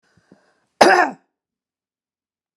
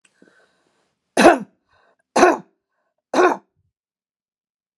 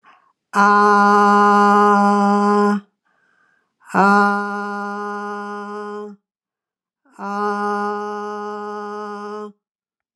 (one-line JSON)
{"cough_length": "2.6 s", "cough_amplitude": 32768, "cough_signal_mean_std_ratio": 0.26, "three_cough_length": "4.8 s", "three_cough_amplitude": 32768, "three_cough_signal_mean_std_ratio": 0.27, "exhalation_length": "10.2 s", "exhalation_amplitude": 30117, "exhalation_signal_mean_std_ratio": 0.59, "survey_phase": "alpha (2021-03-01 to 2021-08-12)", "age": "65+", "gender": "Female", "wearing_mask": "No", "symptom_cough_any": true, "smoker_status": "Never smoked", "respiratory_condition_asthma": true, "respiratory_condition_other": false, "recruitment_source": "REACT", "submission_delay": "1 day", "covid_test_result": "Negative", "covid_test_method": "RT-qPCR"}